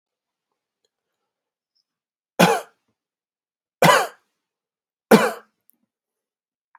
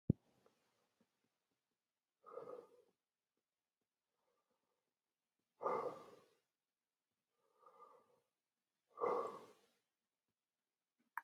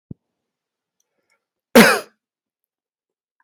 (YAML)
three_cough_length: 6.8 s
three_cough_amplitude: 29121
three_cough_signal_mean_std_ratio: 0.23
exhalation_length: 11.2 s
exhalation_amplitude: 3672
exhalation_signal_mean_std_ratio: 0.21
cough_length: 3.4 s
cough_amplitude: 32768
cough_signal_mean_std_ratio: 0.2
survey_phase: alpha (2021-03-01 to 2021-08-12)
age: 18-44
gender: Male
wearing_mask: 'No'
symptom_none: true
smoker_status: Current smoker (1 to 10 cigarettes per day)
respiratory_condition_asthma: false
respiratory_condition_other: false
recruitment_source: REACT
submission_delay: 1 day
covid_test_result: Negative
covid_test_method: RT-qPCR